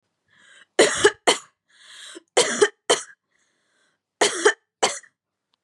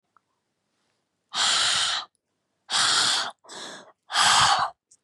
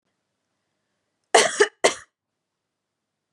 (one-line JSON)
{"three_cough_length": "5.6 s", "three_cough_amplitude": 27521, "three_cough_signal_mean_std_ratio": 0.34, "exhalation_length": "5.0 s", "exhalation_amplitude": 16107, "exhalation_signal_mean_std_ratio": 0.53, "cough_length": "3.3 s", "cough_amplitude": 28132, "cough_signal_mean_std_ratio": 0.23, "survey_phase": "beta (2021-08-13 to 2022-03-07)", "age": "18-44", "gender": "Female", "wearing_mask": "No", "symptom_none": true, "symptom_onset": "3 days", "smoker_status": "Never smoked", "respiratory_condition_asthma": false, "respiratory_condition_other": false, "recruitment_source": "REACT", "submission_delay": "1 day", "covid_test_result": "Negative", "covid_test_method": "RT-qPCR", "influenza_a_test_result": "Unknown/Void", "influenza_b_test_result": "Unknown/Void"}